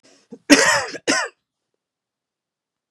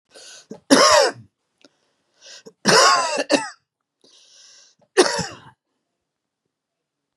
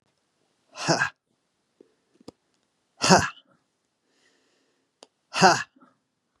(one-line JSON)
{"cough_length": "2.9 s", "cough_amplitude": 32768, "cough_signal_mean_std_ratio": 0.32, "three_cough_length": "7.2 s", "three_cough_amplitude": 32767, "three_cough_signal_mean_std_ratio": 0.35, "exhalation_length": "6.4 s", "exhalation_amplitude": 32753, "exhalation_signal_mean_std_ratio": 0.24, "survey_phase": "beta (2021-08-13 to 2022-03-07)", "age": "45-64", "gender": "Male", "wearing_mask": "No", "symptom_cough_any": true, "symptom_sore_throat": true, "smoker_status": "Ex-smoker", "respiratory_condition_asthma": false, "respiratory_condition_other": false, "recruitment_source": "Test and Trace", "submission_delay": "1 day", "covid_test_result": "Positive", "covid_test_method": "RT-qPCR", "covid_ct_value": 16.5, "covid_ct_gene": "ORF1ab gene"}